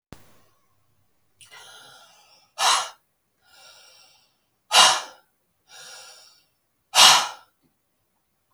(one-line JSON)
{"exhalation_length": "8.5 s", "exhalation_amplitude": 32768, "exhalation_signal_mean_std_ratio": 0.25, "survey_phase": "beta (2021-08-13 to 2022-03-07)", "age": "45-64", "gender": "Female", "wearing_mask": "No", "symptom_cough_any": true, "symptom_new_continuous_cough": true, "symptom_runny_or_blocked_nose": true, "symptom_sore_throat": true, "symptom_fatigue": true, "symptom_headache": true, "smoker_status": "Ex-smoker", "respiratory_condition_asthma": false, "respiratory_condition_other": false, "recruitment_source": "Test and Trace", "submission_delay": "1 day", "covid_test_result": "Positive", "covid_test_method": "LFT"}